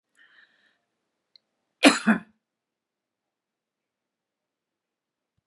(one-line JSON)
{"cough_length": "5.5 s", "cough_amplitude": 30278, "cough_signal_mean_std_ratio": 0.16, "survey_phase": "beta (2021-08-13 to 2022-03-07)", "age": "65+", "gender": "Female", "wearing_mask": "Yes", "symptom_sore_throat": true, "symptom_onset": "12 days", "smoker_status": "Ex-smoker", "respiratory_condition_asthma": false, "respiratory_condition_other": false, "recruitment_source": "REACT", "submission_delay": "2 days", "covid_test_result": "Negative", "covid_test_method": "RT-qPCR", "influenza_a_test_result": "Negative", "influenza_b_test_result": "Negative"}